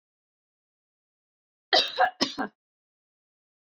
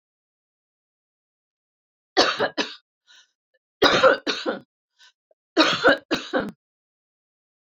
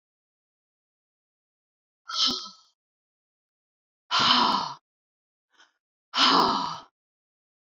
{"cough_length": "3.7 s", "cough_amplitude": 14178, "cough_signal_mean_std_ratio": 0.26, "three_cough_length": "7.7 s", "three_cough_amplitude": 26177, "three_cough_signal_mean_std_ratio": 0.33, "exhalation_length": "7.8 s", "exhalation_amplitude": 18083, "exhalation_signal_mean_std_ratio": 0.34, "survey_phase": "beta (2021-08-13 to 2022-03-07)", "age": "45-64", "gender": "Female", "wearing_mask": "No", "symptom_none": true, "smoker_status": "Never smoked", "respiratory_condition_asthma": false, "respiratory_condition_other": false, "recruitment_source": "REACT", "submission_delay": "3 days", "covid_test_result": "Negative", "covid_test_method": "RT-qPCR", "influenza_a_test_result": "Negative", "influenza_b_test_result": "Negative"}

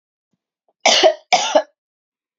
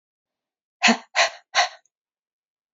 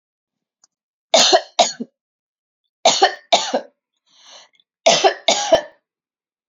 {"cough_length": "2.4 s", "cough_amplitude": 32711, "cough_signal_mean_std_ratio": 0.38, "exhalation_length": "2.7 s", "exhalation_amplitude": 23910, "exhalation_signal_mean_std_ratio": 0.3, "three_cough_length": "6.5 s", "three_cough_amplitude": 31291, "three_cough_signal_mean_std_ratio": 0.36, "survey_phase": "alpha (2021-03-01 to 2021-08-12)", "age": "45-64", "gender": "Female", "wearing_mask": "No", "symptom_abdominal_pain": true, "symptom_fatigue": true, "symptom_onset": "12 days", "smoker_status": "Never smoked", "respiratory_condition_asthma": false, "respiratory_condition_other": false, "recruitment_source": "REACT", "submission_delay": "1 day", "covid_test_result": "Negative", "covid_test_method": "RT-qPCR"}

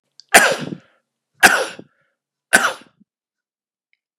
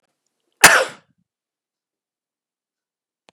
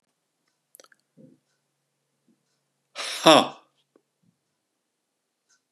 {"three_cough_length": "4.2 s", "three_cough_amplitude": 32768, "three_cough_signal_mean_std_ratio": 0.29, "cough_length": "3.3 s", "cough_amplitude": 32768, "cough_signal_mean_std_ratio": 0.18, "exhalation_length": "5.7 s", "exhalation_amplitude": 32472, "exhalation_signal_mean_std_ratio": 0.16, "survey_phase": "beta (2021-08-13 to 2022-03-07)", "age": "65+", "gender": "Male", "wearing_mask": "No", "symptom_runny_or_blocked_nose": true, "symptom_onset": "4 days", "smoker_status": "Ex-smoker", "respiratory_condition_asthma": false, "respiratory_condition_other": false, "recruitment_source": "Test and Trace", "submission_delay": "1 day", "covid_test_result": "Positive", "covid_test_method": "RT-qPCR", "covid_ct_value": 29.8, "covid_ct_gene": "S gene"}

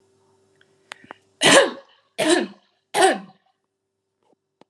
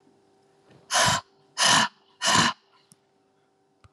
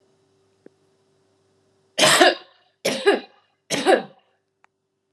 {"three_cough_length": "4.7 s", "three_cough_amplitude": 32245, "three_cough_signal_mean_std_ratio": 0.32, "exhalation_length": "3.9 s", "exhalation_amplitude": 15376, "exhalation_signal_mean_std_ratio": 0.4, "cough_length": "5.1 s", "cough_amplitude": 32339, "cough_signal_mean_std_ratio": 0.33, "survey_phase": "alpha (2021-03-01 to 2021-08-12)", "age": "45-64", "gender": "Female", "wearing_mask": "No", "symptom_none": true, "smoker_status": "Never smoked", "respiratory_condition_asthma": false, "respiratory_condition_other": false, "recruitment_source": "REACT", "submission_delay": "1 day", "covid_test_result": "Negative", "covid_test_method": "RT-qPCR"}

